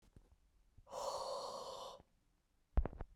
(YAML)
exhalation_length: 3.2 s
exhalation_amplitude: 2568
exhalation_signal_mean_std_ratio: 0.43
survey_phase: beta (2021-08-13 to 2022-03-07)
age: 18-44
gender: Male
wearing_mask: 'No'
symptom_cough_any: true
symptom_sore_throat: true
symptom_fatigue: true
symptom_headache: true
symptom_onset: 5 days
smoker_status: Never smoked
respiratory_condition_asthma: false
respiratory_condition_other: false
recruitment_source: Test and Trace
submission_delay: 2 days
covid_test_result: Positive
covid_test_method: RT-qPCR
covid_ct_value: 12.7
covid_ct_gene: ORF1ab gene